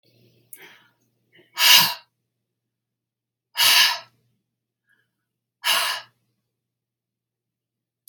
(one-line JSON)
{"exhalation_length": "8.1 s", "exhalation_amplitude": 31370, "exhalation_signal_mean_std_ratio": 0.27, "survey_phase": "beta (2021-08-13 to 2022-03-07)", "age": "45-64", "gender": "Female", "wearing_mask": "No", "symptom_shortness_of_breath": true, "symptom_fatigue": true, "smoker_status": "Never smoked", "respiratory_condition_asthma": false, "respiratory_condition_other": true, "recruitment_source": "REACT", "submission_delay": "3 days", "covid_test_result": "Negative", "covid_test_method": "RT-qPCR", "influenza_a_test_result": "Negative", "influenza_b_test_result": "Negative"}